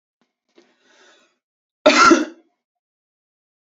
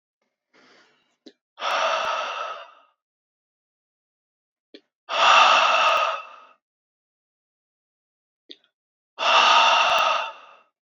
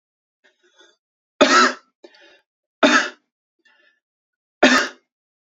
cough_length: 3.7 s
cough_amplitude: 31166
cough_signal_mean_std_ratio: 0.26
exhalation_length: 10.9 s
exhalation_amplitude: 21966
exhalation_signal_mean_std_ratio: 0.42
three_cough_length: 5.5 s
three_cough_amplitude: 30576
three_cough_signal_mean_std_ratio: 0.3
survey_phase: beta (2021-08-13 to 2022-03-07)
age: 18-44
gender: Male
wearing_mask: 'No'
symptom_runny_or_blocked_nose: true
symptom_sore_throat: true
symptom_fatigue: true
symptom_fever_high_temperature: true
symptom_headache: true
smoker_status: Ex-smoker
respiratory_condition_asthma: false
respiratory_condition_other: false
recruitment_source: Test and Trace
submission_delay: 2 days
covid_test_result: Positive
covid_test_method: LFT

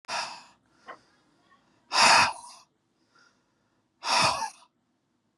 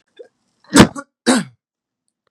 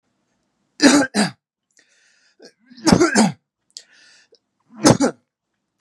exhalation_length: 5.4 s
exhalation_amplitude: 16277
exhalation_signal_mean_std_ratio: 0.33
cough_length: 2.3 s
cough_amplitude: 32768
cough_signal_mean_std_ratio: 0.28
three_cough_length: 5.8 s
three_cough_amplitude: 32767
three_cough_signal_mean_std_ratio: 0.34
survey_phase: beta (2021-08-13 to 2022-03-07)
age: 45-64
gender: Male
wearing_mask: 'No'
symptom_cough_any: true
symptom_fatigue: true
smoker_status: Ex-smoker
respiratory_condition_asthma: false
respiratory_condition_other: false
recruitment_source: Test and Trace
submission_delay: 1 day
covid_test_result: Positive
covid_test_method: RT-qPCR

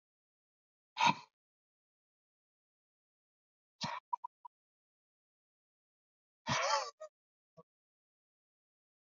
exhalation_length: 9.1 s
exhalation_amplitude: 5300
exhalation_signal_mean_std_ratio: 0.21
survey_phase: beta (2021-08-13 to 2022-03-07)
age: 18-44
gender: Male
wearing_mask: 'No'
symptom_cough_any: true
symptom_other: true
smoker_status: Never smoked
respiratory_condition_asthma: true
respiratory_condition_other: false
recruitment_source: Test and Trace
submission_delay: -1 day
covid_test_result: Negative
covid_test_method: LFT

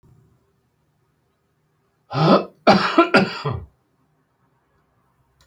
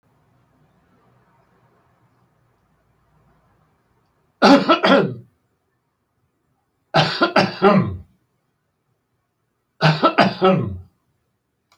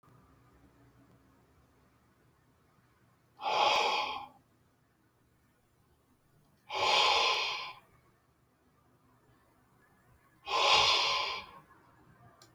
cough_length: 5.5 s
cough_amplitude: 29961
cough_signal_mean_std_ratio: 0.32
three_cough_length: 11.8 s
three_cough_amplitude: 32383
three_cough_signal_mean_std_ratio: 0.33
exhalation_length: 12.5 s
exhalation_amplitude: 8016
exhalation_signal_mean_std_ratio: 0.39
survey_phase: beta (2021-08-13 to 2022-03-07)
age: 65+
gender: Male
wearing_mask: 'No'
symptom_shortness_of_breath: true
symptom_abdominal_pain: true
symptom_fatigue: true
symptom_headache: true
symptom_onset: 12 days
smoker_status: Ex-smoker
respiratory_condition_asthma: false
respiratory_condition_other: false
recruitment_source: REACT
submission_delay: 1 day
covid_test_result: Negative
covid_test_method: RT-qPCR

